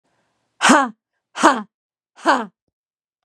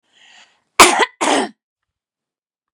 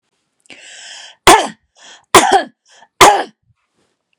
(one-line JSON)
{"exhalation_length": "3.2 s", "exhalation_amplitude": 32768, "exhalation_signal_mean_std_ratio": 0.33, "cough_length": "2.7 s", "cough_amplitude": 32768, "cough_signal_mean_std_ratio": 0.31, "three_cough_length": "4.2 s", "three_cough_amplitude": 32768, "three_cough_signal_mean_std_ratio": 0.33, "survey_phase": "beta (2021-08-13 to 2022-03-07)", "age": "45-64", "gender": "Female", "wearing_mask": "No", "symptom_none": true, "smoker_status": "Never smoked", "respiratory_condition_asthma": false, "respiratory_condition_other": false, "recruitment_source": "REACT", "submission_delay": "3 days", "covid_test_result": "Negative", "covid_test_method": "RT-qPCR", "influenza_a_test_result": "Negative", "influenza_b_test_result": "Negative"}